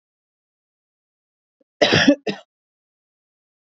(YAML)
cough_length: 3.7 s
cough_amplitude: 27808
cough_signal_mean_std_ratio: 0.24
survey_phase: beta (2021-08-13 to 2022-03-07)
age: 18-44
gender: Female
wearing_mask: 'No'
symptom_none: true
smoker_status: Never smoked
respiratory_condition_asthma: false
respiratory_condition_other: false
recruitment_source: REACT
submission_delay: 1 day
covid_test_result: Negative
covid_test_method: RT-qPCR